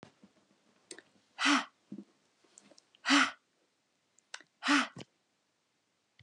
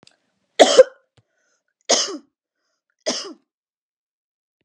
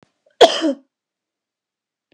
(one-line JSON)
{"exhalation_length": "6.2 s", "exhalation_amplitude": 9416, "exhalation_signal_mean_std_ratio": 0.28, "three_cough_length": "4.6 s", "three_cough_amplitude": 32768, "three_cough_signal_mean_std_ratio": 0.23, "cough_length": "2.1 s", "cough_amplitude": 32768, "cough_signal_mean_std_ratio": 0.24, "survey_phase": "beta (2021-08-13 to 2022-03-07)", "age": "18-44", "gender": "Female", "wearing_mask": "No", "symptom_none": true, "smoker_status": "Ex-smoker", "respiratory_condition_asthma": false, "respiratory_condition_other": false, "recruitment_source": "REACT", "submission_delay": "2 days", "covid_test_result": "Negative", "covid_test_method": "RT-qPCR", "influenza_a_test_result": "Negative", "influenza_b_test_result": "Negative"}